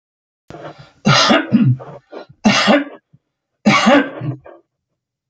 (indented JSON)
{
  "three_cough_length": "5.3 s",
  "three_cough_amplitude": 32019,
  "three_cough_signal_mean_std_ratio": 0.48,
  "survey_phase": "alpha (2021-03-01 to 2021-08-12)",
  "age": "65+",
  "gender": "Male",
  "wearing_mask": "No",
  "symptom_none": true,
  "smoker_status": "Never smoked",
  "respiratory_condition_asthma": false,
  "respiratory_condition_other": false,
  "recruitment_source": "REACT",
  "submission_delay": "2 days",
  "covid_test_result": "Negative",
  "covid_test_method": "RT-qPCR"
}